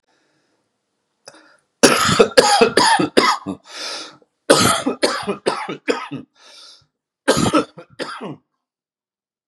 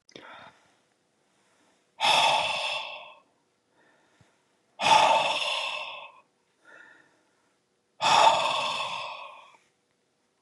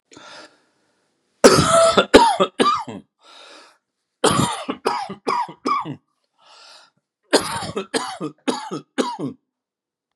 {"cough_length": "9.5 s", "cough_amplitude": 32768, "cough_signal_mean_std_ratio": 0.44, "exhalation_length": "10.4 s", "exhalation_amplitude": 16621, "exhalation_signal_mean_std_ratio": 0.42, "three_cough_length": "10.2 s", "three_cough_amplitude": 32768, "three_cough_signal_mean_std_ratio": 0.41, "survey_phase": "beta (2021-08-13 to 2022-03-07)", "age": "65+", "gender": "Male", "wearing_mask": "No", "symptom_none": true, "smoker_status": "Ex-smoker", "respiratory_condition_asthma": false, "respiratory_condition_other": false, "recruitment_source": "REACT", "submission_delay": "3 days", "covid_test_result": "Negative", "covid_test_method": "RT-qPCR"}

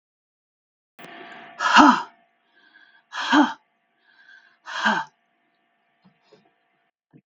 {"exhalation_length": "7.3 s", "exhalation_amplitude": 32767, "exhalation_signal_mean_std_ratio": 0.28, "survey_phase": "beta (2021-08-13 to 2022-03-07)", "age": "45-64", "gender": "Female", "wearing_mask": "No", "symptom_cough_any": true, "symptom_runny_or_blocked_nose": true, "symptom_fatigue": true, "symptom_fever_high_temperature": true, "symptom_change_to_sense_of_smell_or_taste": true, "symptom_onset": "3 days", "smoker_status": "Never smoked", "respiratory_condition_asthma": false, "respiratory_condition_other": false, "recruitment_source": "Test and Trace", "submission_delay": "2 days", "covid_test_result": "Positive", "covid_test_method": "RT-qPCR", "covid_ct_value": 14.8, "covid_ct_gene": "ORF1ab gene", "covid_ct_mean": 15.9, "covid_viral_load": "6000000 copies/ml", "covid_viral_load_category": "High viral load (>1M copies/ml)"}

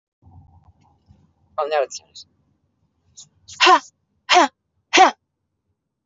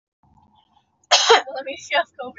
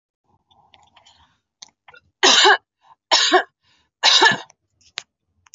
{"exhalation_length": "6.1 s", "exhalation_amplitude": 32768, "exhalation_signal_mean_std_ratio": 0.29, "cough_length": "2.4 s", "cough_amplitude": 28608, "cough_signal_mean_std_ratio": 0.38, "three_cough_length": "5.5 s", "three_cough_amplitude": 30963, "three_cough_signal_mean_std_ratio": 0.34, "survey_phase": "beta (2021-08-13 to 2022-03-07)", "age": "45-64", "gender": "Female", "wearing_mask": "No", "symptom_none": true, "smoker_status": "Never smoked", "respiratory_condition_asthma": false, "respiratory_condition_other": false, "recruitment_source": "REACT", "submission_delay": "1 day", "covid_test_result": "Negative", "covid_test_method": "RT-qPCR"}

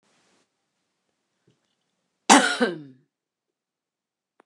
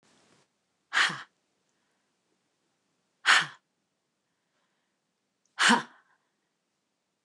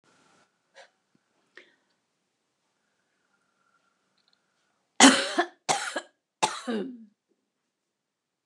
{"cough_length": "4.5 s", "cough_amplitude": 29203, "cough_signal_mean_std_ratio": 0.21, "exhalation_length": "7.2 s", "exhalation_amplitude": 14938, "exhalation_signal_mean_std_ratio": 0.23, "three_cough_length": "8.5 s", "three_cough_amplitude": 28919, "three_cough_signal_mean_std_ratio": 0.21, "survey_phase": "beta (2021-08-13 to 2022-03-07)", "age": "65+", "gender": "Female", "wearing_mask": "No", "symptom_runny_or_blocked_nose": true, "smoker_status": "Never smoked", "respiratory_condition_asthma": false, "respiratory_condition_other": false, "recruitment_source": "REACT", "submission_delay": "1 day", "covid_test_result": "Negative", "covid_test_method": "RT-qPCR", "influenza_a_test_result": "Negative", "influenza_b_test_result": "Negative"}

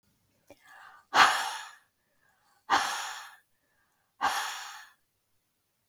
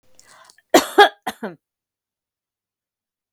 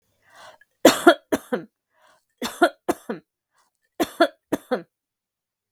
{"exhalation_length": "5.9 s", "exhalation_amplitude": 22876, "exhalation_signal_mean_std_ratio": 0.33, "cough_length": "3.3 s", "cough_amplitude": 32768, "cough_signal_mean_std_ratio": 0.21, "three_cough_length": "5.7 s", "three_cough_amplitude": 32768, "three_cough_signal_mean_std_ratio": 0.26, "survey_phase": "beta (2021-08-13 to 2022-03-07)", "age": "45-64", "gender": "Female", "wearing_mask": "No", "symptom_none": true, "smoker_status": "Never smoked", "respiratory_condition_asthma": false, "respiratory_condition_other": false, "recruitment_source": "REACT", "submission_delay": "1 day", "covid_test_result": "Negative", "covid_test_method": "RT-qPCR", "influenza_a_test_result": "Negative", "influenza_b_test_result": "Negative"}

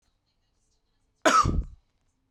{"cough_length": "2.3 s", "cough_amplitude": 18742, "cough_signal_mean_std_ratio": 0.32, "survey_phase": "beta (2021-08-13 to 2022-03-07)", "age": "18-44", "gender": "Male", "wearing_mask": "No", "symptom_none": true, "smoker_status": "Current smoker (e-cigarettes or vapes only)", "respiratory_condition_asthma": false, "respiratory_condition_other": false, "recruitment_source": "REACT", "submission_delay": "1 day", "covid_test_result": "Negative", "covid_test_method": "RT-qPCR"}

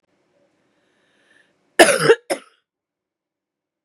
{"cough_length": "3.8 s", "cough_amplitude": 32768, "cough_signal_mean_std_ratio": 0.23, "survey_phase": "beta (2021-08-13 to 2022-03-07)", "age": "45-64", "gender": "Female", "wearing_mask": "No", "symptom_cough_any": true, "symptom_runny_or_blocked_nose": true, "symptom_sore_throat": true, "symptom_abdominal_pain": true, "symptom_fatigue": true, "symptom_fever_high_temperature": true, "symptom_headache": true, "symptom_change_to_sense_of_smell_or_taste": true, "symptom_loss_of_taste": true, "symptom_onset": "2 days", "smoker_status": "Current smoker (1 to 10 cigarettes per day)", "respiratory_condition_asthma": false, "respiratory_condition_other": false, "recruitment_source": "Test and Trace", "submission_delay": "2 days", "covid_test_result": "Positive", "covid_test_method": "RT-qPCR", "covid_ct_value": 23.5, "covid_ct_gene": "N gene"}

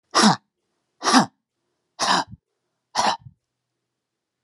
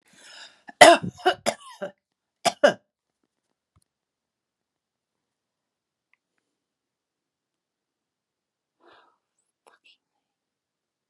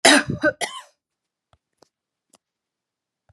{"exhalation_length": "4.4 s", "exhalation_amplitude": 29490, "exhalation_signal_mean_std_ratio": 0.34, "three_cough_length": "11.1 s", "three_cough_amplitude": 32768, "three_cough_signal_mean_std_ratio": 0.15, "cough_length": "3.3 s", "cough_amplitude": 31735, "cough_signal_mean_std_ratio": 0.26, "survey_phase": "alpha (2021-03-01 to 2021-08-12)", "age": "65+", "gender": "Female", "wearing_mask": "No", "symptom_none": true, "smoker_status": "Never smoked", "respiratory_condition_asthma": false, "respiratory_condition_other": false, "recruitment_source": "REACT", "submission_delay": "1 day", "covid_test_result": "Negative", "covid_test_method": "RT-qPCR"}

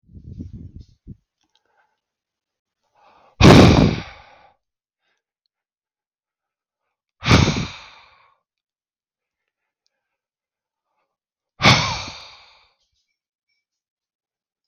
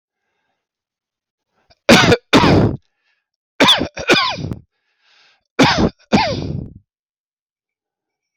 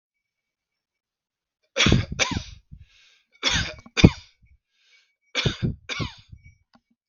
{"exhalation_length": "14.7 s", "exhalation_amplitude": 32768, "exhalation_signal_mean_std_ratio": 0.22, "cough_length": "8.4 s", "cough_amplitude": 32768, "cough_signal_mean_std_ratio": 0.4, "three_cough_length": "7.1 s", "three_cough_amplitude": 32768, "three_cough_signal_mean_std_ratio": 0.29, "survey_phase": "beta (2021-08-13 to 2022-03-07)", "age": "45-64", "gender": "Male", "wearing_mask": "No", "symptom_none": true, "smoker_status": "Never smoked", "respiratory_condition_asthma": false, "respiratory_condition_other": false, "recruitment_source": "REACT", "submission_delay": "3 days", "covid_test_result": "Negative", "covid_test_method": "RT-qPCR", "influenza_a_test_result": "Positive", "influenza_a_ct_value": 35.8, "influenza_b_test_result": "Negative"}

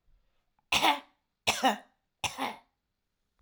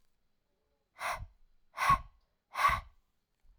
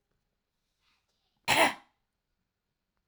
{"three_cough_length": "3.4 s", "three_cough_amplitude": 10828, "three_cough_signal_mean_std_ratio": 0.35, "exhalation_length": "3.6 s", "exhalation_amplitude": 5962, "exhalation_signal_mean_std_ratio": 0.33, "cough_length": "3.1 s", "cough_amplitude": 10958, "cough_signal_mean_std_ratio": 0.22, "survey_phase": "alpha (2021-03-01 to 2021-08-12)", "age": "18-44", "gender": "Female", "wearing_mask": "No", "symptom_headache": true, "smoker_status": "Never smoked", "respiratory_condition_asthma": false, "respiratory_condition_other": false, "recruitment_source": "Test and Trace", "submission_delay": "2 days", "covid_test_result": "Positive", "covid_test_method": "RT-qPCR", "covid_ct_value": 16.3, "covid_ct_gene": "ORF1ab gene", "covid_ct_mean": 16.7, "covid_viral_load": "3400000 copies/ml", "covid_viral_load_category": "High viral load (>1M copies/ml)"}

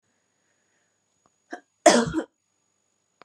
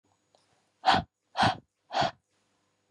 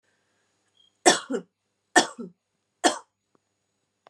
{"cough_length": "3.2 s", "cough_amplitude": 27679, "cough_signal_mean_std_ratio": 0.22, "exhalation_length": "2.9 s", "exhalation_amplitude": 10063, "exhalation_signal_mean_std_ratio": 0.33, "three_cough_length": "4.1 s", "three_cough_amplitude": 26337, "three_cough_signal_mean_std_ratio": 0.23, "survey_phase": "beta (2021-08-13 to 2022-03-07)", "age": "18-44", "gender": "Female", "wearing_mask": "No", "symptom_runny_or_blocked_nose": true, "symptom_sore_throat": true, "symptom_onset": "9 days", "smoker_status": "Never smoked", "respiratory_condition_asthma": false, "respiratory_condition_other": false, "recruitment_source": "REACT", "submission_delay": "2 days", "covid_test_result": "Negative", "covid_test_method": "RT-qPCR", "influenza_a_test_result": "Negative", "influenza_b_test_result": "Negative"}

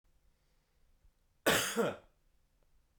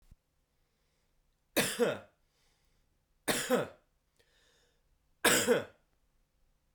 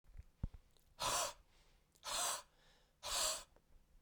{"cough_length": "3.0 s", "cough_amplitude": 5565, "cough_signal_mean_std_ratio": 0.32, "three_cough_length": "6.7 s", "three_cough_amplitude": 8634, "three_cough_signal_mean_std_ratio": 0.32, "exhalation_length": "4.0 s", "exhalation_amplitude": 1566, "exhalation_signal_mean_std_ratio": 0.48, "survey_phase": "beta (2021-08-13 to 2022-03-07)", "age": "18-44", "gender": "Male", "wearing_mask": "No", "symptom_cough_any": true, "symptom_runny_or_blocked_nose": true, "symptom_sore_throat": true, "symptom_other": true, "smoker_status": "Never smoked", "respiratory_condition_asthma": false, "respiratory_condition_other": false, "recruitment_source": "Test and Trace", "submission_delay": "1 day", "covid_test_result": "Positive", "covid_test_method": "RT-qPCR", "covid_ct_value": 32.1, "covid_ct_gene": "N gene"}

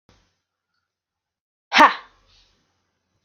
{"exhalation_length": "3.2 s", "exhalation_amplitude": 27909, "exhalation_signal_mean_std_ratio": 0.19, "survey_phase": "alpha (2021-03-01 to 2021-08-12)", "age": "45-64", "gender": "Female", "wearing_mask": "No", "symptom_headache": true, "smoker_status": "Never smoked", "respiratory_condition_asthma": false, "respiratory_condition_other": false, "recruitment_source": "REACT", "submission_delay": "1 day", "covid_test_result": "Negative", "covid_test_method": "RT-qPCR"}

